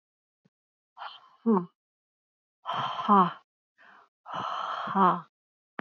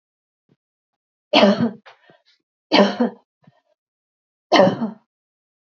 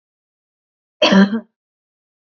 exhalation_length: 5.8 s
exhalation_amplitude: 12759
exhalation_signal_mean_std_ratio: 0.37
three_cough_length: 5.7 s
three_cough_amplitude: 28794
three_cough_signal_mean_std_ratio: 0.33
cough_length: 2.3 s
cough_amplitude: 27327
cough_signal_mean_std_ratio: 0.31
survey_phase: beta (2021-08-13 to 2022-03-07)
age: 45-64
gender: Female
wearing_mask: 'No'
symptom_other: true
smoker_status: Never smoked
respiratory_condition_asthma: false
respiratory_condition_other: false
recruitment_source: REACT
submission_delay: 5 days
covid_test_result: Negative
covid_test_method: RT-qPCR
influenza_a_test_result: Negative
influenza_b_test_result: Negative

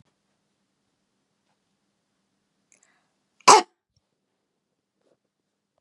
cough_length: 5.8 s
cough_amplitude: 32421
cough_signal_mean_std_ratio: 0.12
survey_phase: beta (2021-08-13 to 2022-03-07)
age: 65+
gender: Female
wearing_mask: 'No'
symptom_cough_any: true
symptom_runny_or_blocked_nose: true
smoker_status: Ex-smoker
respiratory_condition_asthma: false
respiratory_condition_other: false
recruitment_source: REACT
submission_delay: 2 days
covid_test_result: Negative
covid_test_method: RT-qPCR
influenza_a_test_result: Negative
influenza_b_test_result: Negative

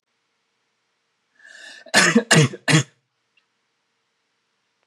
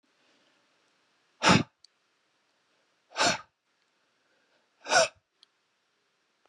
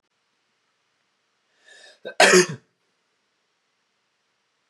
three_cough_length: 4.9 s
three_cough_amplitude: 29581
three_cough_signal_mean_std_ratio: 0.29
exhalation_length: 6.5 s
exhalation_amplitude: 13432
exhalation_signal_mean_std_ratio: 0.23
cough_length: 4.7 s
cough_amplitude: 27714
cough_signal_mean_std_ratio: 0.2
survey_phase: beta (2021-08-13 to 2022-03-07)
age: 18-44
gender: Male
wearing_mask: 'No'
symptom_cough_any: true
symptom_new_continuous_cough: true
symptom_sore_throat: true
symptom_fatigue: true
symptom_other: true
symptom_onset: 2 days
smoker_status: Never smoked
respiratory_condition_asthma: false
respiratory_condition_other: false
recruitment_source: Test and Trace
submission_delay: 2 days
covid_test_result: Positive
covid_test_method: RT-qPCR
covid_ct_value: 25.7
covid_ct_gene: ORF1ab gene
covid_ct_mean: 26.2
covid_viral_load: 2600 copies/ml
covid_viral_load_category: Minimal viral load (< 10K copies/ml)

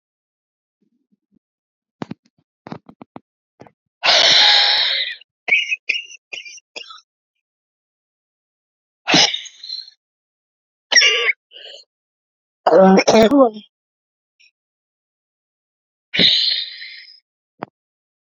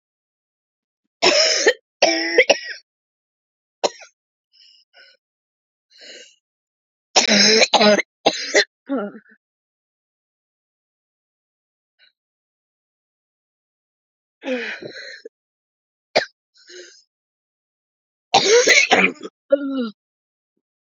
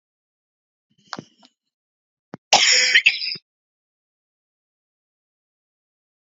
exhalation_length: 18.3 s
exhalation_amplitude: 32768
exhalation_signal_mean_std_ratio: 0.35
three_cough_length: 21.0 s
three_cough_amplitude: 32767
three_cough_signal_mean_std_ratio: 0.32
cough_length: 6.4 s
cough_amplitude: 32767
cough_signal_mean_std_ratio: 0.25
survey_phase: beta (2021-08-13 to 2022-03-07)
age: 18-44
gender: Female
wearing_mask: 'No'
symptom_cough_any: true
symptom_runny_or_blocked_nose: true
symptom_shortness_of_breath: true
symptom_sore_throat: true
symptom_fatigue: true
symptom_headache: true
symptom_other: true
smoker_status: Ex-smoker
respiratory_condition_asthma: true
respiratory_condition_other: false
recruitment_source: Test and Trace
submission_delay: 1 day
covid_test_result: Positive
covid_test_method: LFT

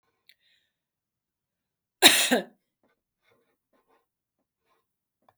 cough_length: 5.4 s
cough_amplitude: 32766
cough_signal_mean_std_ratio: 0.18
survey_phase: beta (2021-08-13 to 2022-03-07)
age: 45-64
gender: Female
wearing_mask: 'No'
symptom_none: true
symptom_onset: 3 days
smoker_status: Never smoked
respiratory_condition_asthma: false
respiratory_condition_other: false
recruitment_source: REACT
submission_delay: 1 day
covid_test_result: Negative
covid_test_method: RT-qPCR
influenza_a_test_result: Negative
influenza_b_test_result: Negative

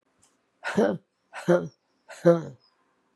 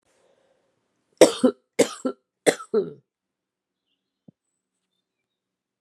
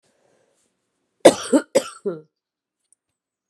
exhalation_length: 3.2 s
exhalation_amplitude: 20618
exhalation_signal_mean_std_ratio: 0.34
three_cough_length: 5.8 s
three_cough_amplitude: 32768
three_cough_signal_mean_std_ratio: 0.21
cough_length: 3.5 s
cough_amplitude: 32768
cough_signal_mean_std_ratio: 0.22
survey_phase: beta (2021-08-13 to 2022-03-07)
age: 45-64
gender: Female
wearing_mask: 'No'
symptom_cough_any: true
symptom_new_continuous_cough: true
symptom_runny_or_blocked_nose: true
symptom_shortness_of_breath: true
symptom_abdominal_pain: true
symptom_fatigue: true
symptom_fever_high_temperature: true
symptom_headache: true
symptom_change_to_sense_of_smell_or_taste: true
symptom_loss_of_taste: true
symptom_onset: 2 days
smoker_status: Ex-smoker
respiratory_condition_asthma: false
respiratory_condition_other: false
recruitment_source: Test and Trace
submission_delay: -1 day
covid_test_result: Positive
covid_test_method: RT-qPCR
covid_ct_value: 22.1
covid_ct_gene: N gene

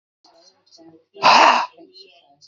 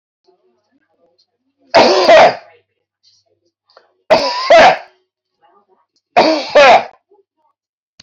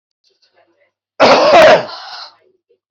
exhalation_length: 2.5 s
exhalation_amplitude: 28116
exhalation_signal_mean_std_ratio: 0.35
three_cough_length: 8.0 s
three_cough_amplitude: 31423
three_cough_signal_mean_std_ratio: 0.4
cough_length: 2.9 s
cough_amplitude: 30708
cough_signal_mean_std_ratio: 0.44
survey_phase: beta (2021-08-13 to 2022-03-07)
age: 45-64
gender: Male
wearing_mask: 'No'
symptom_none: true
smoker_status: Ex-smoker
respiratory_condition_asthma: false
respiratory_condition_other: false
recruitment_source: REACT
submission_delay: 0 days
covid_test_result: Negative
covid_test_method: RT-qPCR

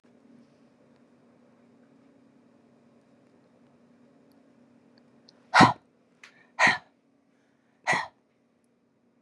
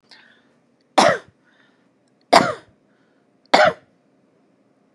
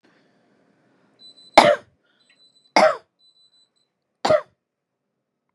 exhalation_length: 9.2 s
exhalation_amplitude: 23838
exhalation_signal_mean_std_ratio: 0.19
cough_length: 4.9 s
cough_amplitude: 32768
cough_signal_mean_std_ratio: 0.26
three_cough_length: 5.5 s
three_cough_amplitude: 32768
three_cough_signal_mean_std_ratio: 0.23
survey_phase: beta (2021-08-13 to 2022-03-07)
age: 45-64
gender: Female
wearing_mask: 'No'
symptom_headache: true
smoker_status: Ex-smoker
respiratory_condition_asthma: false
respiratory_condition_other: false
recruitment_source: REACT
submission_delay: 1 day
covid_test_result: Negative
covid_test_method: RT-qPCR
influenza_a_test_result: Negative
influenza_b_test_result: Negative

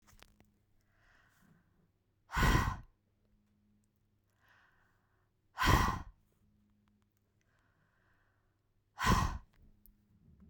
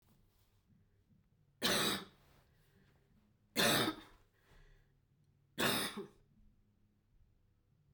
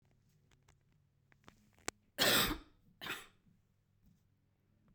exhalation_length: 10.5 s
exhalation_amplitude: 7234
exhalation_signal_mean_std_ratio: 0.27
three_cough_length: 7.9 s
three_cough_amplitude: 4060
three_cough_signal_mean_std_ratio: 0.33
cough_length: 4.9 s
cough_amplitude: 5078
cough_signal_mean_std_ratio: 0.26
survey_phase: beta (2021-08-13 to 2022-03-07)
age: 45-64
gender: Female
wearing_mask: 'No'
symptom_none: true
smoker_status: Ex-smoker
respiratory_condition_asthma: false
respiratory_condition_other: false
recruitment_source: REACT
submission_delay: 1 day
covid_test_result: Negative
covid_test_method: RT-qPCR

